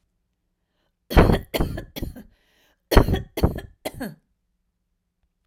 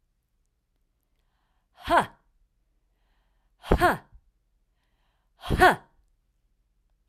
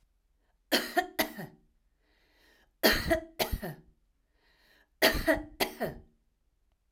{"cough_length": "5.5 s", "cough_amplitude": 32767, "cough_signal_mean_std_ratio": 0.31, "exhalation_length": "7.1 s", "exhalation_amplitude": 19312, "exhalation_signal_mean_std_ratio": 0.24, "three_cough_length": "6.9 s", "three_cough_amplitude": 12491, "three_cough_signal_mean_std_ratio": 0.36, "survey_phase": "alpha (2021-03-01 to 2021-08-12)", "age": "65+", "gender": "Female", "wearing_mask": "No", "symptom_none": true, "smoker_status": "Never smoked", "respiratory_condition_asthma": true, "respiratory_condition_other": false, "recruitment_source": "REACT", "submission_delay": "1 day", "covid_test_result": "Negative", "covid_test_method": "RT-qPCR"}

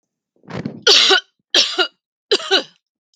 {"three_cough_length": "3.2 s", "three_cough_amplitude": 32768, "three_cough_signal_mean_std_ratio": 0.43, "survey_phase": "beta (2021-08-13 to 2022-03-07)", "age": "45-64", "gender": "Female", "wearing_mask": "No", "symptom_change_to_sense_of_smell_or_taste": true, "symptom_loss_of_taste": true, "symptom_onset": "12 days", "smoker_status": "Never smoked", "respiratory_condition_asthma": false, "respiratory_condition_other": false, "recruitment_source": "REACT", "submission_delay": "1 day", "covid_test_result": "Negative", "covid_test_method": "RT-qPCR", "influenza_a_test_result": "Negative", "influenza_b_test_result": "Negative"}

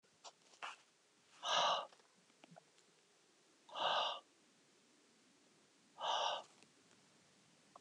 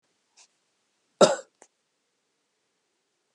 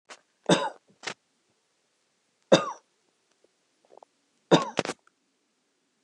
{"exhalation_length": "7.8 s", "exhalation_amplitude": 1984, "exhalation_signal_mean_std_ratio": 0.37, "cough_length": "3.3 s", "cough_amplitude": 23473, "cough_signal_mean_std_ratio": 0.15, "three_cough_length": "6.0 s", "three_cough_amplitude": 25790, "three_cough_signal_mean_std_ratio": 0.22, "survey_phase": "beta (2021-08-13 to 2022-03-07)", "age": "65+", "gender": "Male", "wearing_mask": "No", "symptom_none": true, "smoker_status": "Never smoked", "respiratory_condition_asthma": false, "respiratory_condition_other": false, "recruitment_source": "REACT", "submission_delay": "2 days", "covid_test_result": "Negative", "covid_test_method": "RT-qPCR", "influenza_a_test_result": "Unknown/Void", "influenza_b_test_result": "Unknown/Void"}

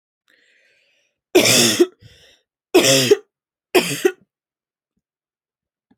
{"three_cough_length": "6.0 s", "three_cough_amplitude": 32767, "three_cough_signal_mean_std_ratio": 0.35, "survey_phase": "alpha (2021-03-01 to 2021-08-12)", "age": "18-44", "gender": "Female", "wearing_mask": "No", "symptom_none": true, "smoker_status": "Never smoked", "respiratory_condition_asthma": false, "respiratory_condition_other": false, "recruitment_source": "REACT", "submission_delay": "1 day", "covid_test_result": "Negative", "covid_test_method": "RT-qPCR"}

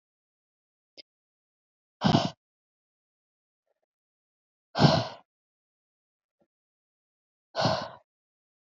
{"exhalation_length": "8.6 s", "exhalation_amplitude": 13755, "exhalation_signal_mean_std_ratio": 0.23, "survey_phase": "alpha (2021-03-01 to 2021-08-12)", "age": "18-44", "gender": "Female", "wearing_mask": "No", "symptom_cough_any": true, "symptom_shortness_of_breath": true, "symptom_fatigue": true, "symptom_headache": true, "symptom_loss_of_taste": true, "smoker_status": "Never smoked", "respiratory_condition_asthma": false, "respiratory_condition_other": false, "recruitment_source": "Test and Trace", "submission_delay": "2 days", "covid_test_result": "Positive", "covid_test_method": "ePCR"}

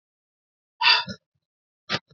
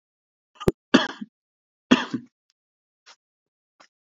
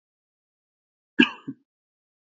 {"exhalation_length": "2.1 s", "exhalation_amplitude": 20985, "exhalation_signal_mean_std_ratio": 0.29, "three_cough_length": "4.1 s", "three_cough_amplitude": 27582, "three_cough_signal_mean_std_ratio": 0.2, "cough_length": "2.2 s", "cough_amplitude": 27752, "cough_signal_mean_std_ratio": 0.15, "survey_phase": "beta (2021-08-13 to 2022-03-07)", "age": "45-64", "gender": "Male", "wearing_mask": "No", "symptom_sore_throat": true, "symptom_headache": true, "symptom_onset": "4 days", "smoker_status": "Never smoked", "respiratory_condition_asthma": true, "respiratory_condition_other": false, "recruitment_source": "Test and Trace", "submission_delay": "3 days", "covid_test_result": "Positive", "covid_test_method": "ePCR"}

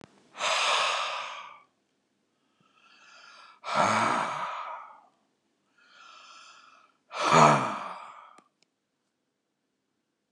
{"exhalation_length": "10.3 s", "exhalation_amplitude": 17747, "exhalation_signal_mean_std_ratio": 0.38, "survey_phase": "beta (2021-08-13 to 2022-03-07)", "age": "65+", "gender": "Male", "wearing_mask": "No", "symptom_cough_any": true, "symptom_runny_or_blocked_nose": true, "symptom_onset": "12 days", "smoker_status": "Never smoked", "respiratory_condition_asthma": false, "respiratory_condition_other": false, "recruitment_source": "REACT", "submission_delay": "1 day", "covid_test_result": "Negative", "covid_test_method": "RT-qPCR", "influenza_a_test_result": "Negative", "influenza_b_test_result": "Negative"}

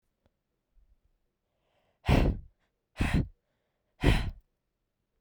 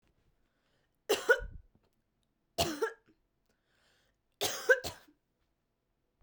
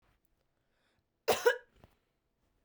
{"exhalation_length": "5.2 s", "exhalation_amplitude": 11601, "exhalation_signal_mean_std_ratio": 0.31, "three_cough_length": "6.2 s", "three_cough_amplitude": 8305, "three_cough_signal_mean_std_ratio": 0.26, "cough_length": "2.6 s", "cough_amplitude": 6831, "cough_signal_mean_std_ratio": 0.22, "survey_phase": "beta (2021-08-13 to 2022-03-07)", "age": "18-44", "gender": "Female", "wearing_mask": "No", "symptom_sore_throat": true, "smoker_status": "Never smoked", "respiratory_condition_asthma": false, "respiratory_condition_other": false, "recruitment_source": "REACT", "submission_delay": "1 day", "covid_test_result": "Negative", "covid_test_method": "RT-qPCR"}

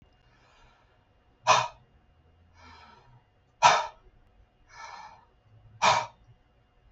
{"exhalation_length": "6.9 s", "exhalation_amplitude": 19627, "exhalation_signal_mean_std_ratio": 0.26, "survey_phase": "beta (2021-08-13 to 2022-03-07)", "age": "65+", "gender": "Male", "wearing_mask": "No", "symptom_none": true, "smoker_status": "Never smoked", "respiratory_condition_asthma": false, "respiratory_condition_other": false, "recruitment_source": "REACT", "submission_delay": "0 days", "covid_test_result": "Negative", "covid_test_method": "RT-qPCR", "influenza_a_test_result": "Negative", "influenza_b_test_result": "Negative"}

